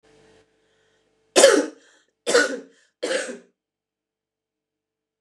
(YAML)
three_cough_length: 5.2 s
three_cough_amplitude: 29203
three_cough_signal_mean_std_ratio: 0.28
survey_phase: beta (2021-08-13 to 2022-03-07)
age: 45-64
gender: Female
wearing_mask: 'No'
symptom_cough_any: true
symptom_runny_or_blocked_nose: true
symptom_fatigue: true
symptom_onset: 5 days
smoker_status: Ex-smoker
respiratory_condition_asthma: false
respiratory_condition_other: false
recruitment_source: Test and Trace
submission_delay: 3 days
covid_test_result: Positive
covid_test_method: RT-qPCR
covid_ct_value: 14.6
covid_ct_gene: ORF1ab gene
covid_ct_mean: 14.8
covid_viral_load: 14000000 copies/ml
covid_viral_load_category: High viral load (>1M copies/ml)